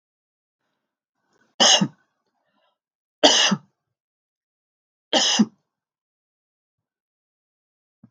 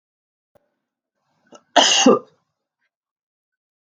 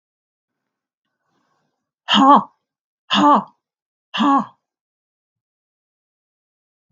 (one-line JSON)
{"three_cough_length": "8.1 s", "three_cough_amplitude": 32766, "three_cough_signal_mean_std_ratio": 0.26, "cough_length": "3.8 s", "cough_amplitude": 32768, "cough_signal_mean_std_ratio": 0.26, "exhalation_length": "6.9 s", "exhalation_amplitude": 31606, "exhalation_signal_mean_std_ratio": 0.29, "survey_phase": "beta (2021-08-13 to 2022-03-07)", "age": "45-64", "gender": "Female", "wearing_mask": "No", "symptom_runny_or_blocked_nose": true, "smoker_status": "Never smoked", "respiratory_condition_asthma": false, "respiratory_condition_other": false, "recruitment_source": "REACT", "submission_delay": "1 day", "covid_test_result": "Negative", "covid_test_method": "RT-qPCR"}